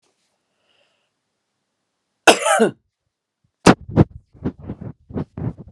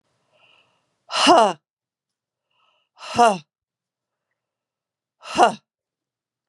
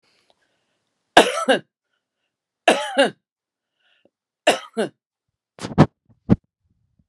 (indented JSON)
{
  "cough_length": "5.7 s",
  "cough_amplitude": 32768,
  "cough_signal_mean_std_ratio": 0.27,
  "exhalation_length": "6.5 s",
  "exhalation_amplitude": 31357,
  "exhalation_signal_mean_std_ratio": 0.26,
  "three_cough_length": "7.1 s",
  "three_cough_amplitude": 32768,
  "three_cough_signal_mean_std_ratio": 0.26,
  "survey_phase": "beta (2021-08-13 to 2022-03-07)",
  "age": "65+",
  "gender": "Female",
  "wearing_mask": "No",
  "symptom_none": true,
  "smoker_status": "Ex-smoker",
  "respiratory_condition_asthma": false,
  "respiratory_condition_other": false,
  "recruitment_source": "REACT",
  "submission_delay": "1 day",
  "covid_test_result": "Negative",
  "covid_test_method": "RT-qPCR"
}